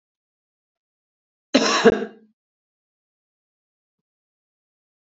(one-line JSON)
{"cough_length": "5.0 s", "cough_amplitude": 26557, "cough_signal_mean_std_ratio": 0.21, "survey_phase": "beta (2021-08-13 to 2022-03-07)", "age": "18-44", "gender": "Female", "wearing_mask": "No", "symptom_none": true, "smoker_status": "Current smoker (1 to 10 cigarettes per day)", "respiratory_condition_asthma": true, "respiratory_condition_other": false, "recruitment_source": "Test and Trace", "submission_delay": "2 days", "covid_test_result": "Negative", "covid_test_method": "ePCR"}